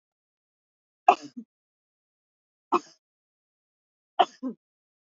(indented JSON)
{
  "three_cough_length": "5.1 s",
  "three_cough_amplitude": 24309,
  "three_cough_signal_mean_std_ratio": 0.16,
  "survey_phase": "alpha (2021-03-01 to 2021-08-12)",
  "age": "45-64",
  "gender": "Female",
  "wearing_mask": "No",
  "symptom_none": true,
  "smoker_status": "Never smoked",
  "respiratory_condition_asthma": false,
  "respiratory_condition_other": false,
  "recruitment_source": "REACT",
  "submission_delay": "4 days",
  "covid_test_result": "Negative",
  "covid_test_method": "RT-qPCR"
}